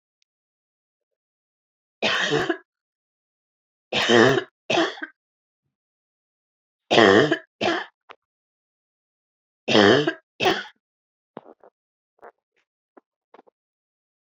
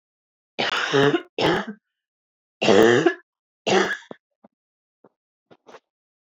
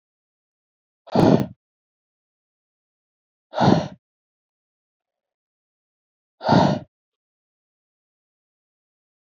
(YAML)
three_cough_length: 14.3 s
three_cough_amplitude: 27249
three_cough_signal_mean_std_ratio: 0.31
cough_length: 6.3 s
cough_amplitude: 25899
cough_signal_mean_std_ratio: 0.4
exhalation_length: 9.2 s
exhalation_amplitude: 26651
exhalation_signal_mean_std_ratio: 0.24
survey_phase: alpha (2021-03-01 to 2021-08-12)
age: 18-44
gender: Female
wearing_mask: 'No'
symptom_none: true
smoker_status: Never smoked
recruitment_source: REACT
submission_delay: 1 day
covid_test_result: Negative
covid_test_method: RT-qPCR